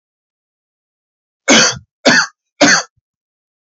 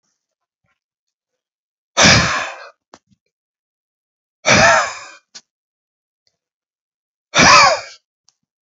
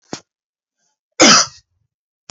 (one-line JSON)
{"three_cough_length": "3.7 s", "three_cough_amplitude": 32768, "three_cough_signal_mean_std_ratio": 0.36, "exhalation_length": "8.6 s", "exhalation_amplitude": 32767, "exhalation_signal_mean_std_ratio": 0.32, "cough_length": "2.3 s", "cough_amplitude": 32767, "cough_signal_mean_std_ratio": 0.28, "survey_phase": "beta (2021-08-13 to 2022-03-07)", "age": "18-44", "gender": "Male", "wearing_mask": "No", "symptom_none": true, "smoker_status": "Never smoked", "respiratory_condition_asthma": true, "respiratory_condition_other": false, "recruitment_source": "REACT", "submission_delay": "2 days", "covid_test_result": "Negative", "covid_test_method": "RT-qPCR", "influenza_a_test_result": "Negative", "influenza_b_test_result": "Negative"}